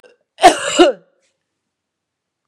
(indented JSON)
{
  "cough_length": "2.5 s",
  "cough_amplitude": 32768,
  "cough_signal_mean_std_ratio": 0.3,
  "survey_phase": "beta (2021-08-13 to 2022-03-07)",
  "age": "45-64",
  "gender": "Female",
  "wearing_mask": "No",
  "symptom_cough_any": true,
  "symptom_runny_or_blocked_nose": true,
  "symptom_fatigue": true,
  "symptom_change_to_sense_of_smell_or_taste": true,
  "symptom_loss_of_taste": true,
  "symptom_onset": "2 days",
  "smoker_status": "Never smoked",
  "respiratory_condition_asthma": false,
  "respiratory_condition_other": false,
  "recruitment_source": "Test and Trace",
  "submission_delay": "1 day",
  "covid_test_result": "Positive",
  "covid_test_method": "RT-qPCR"
}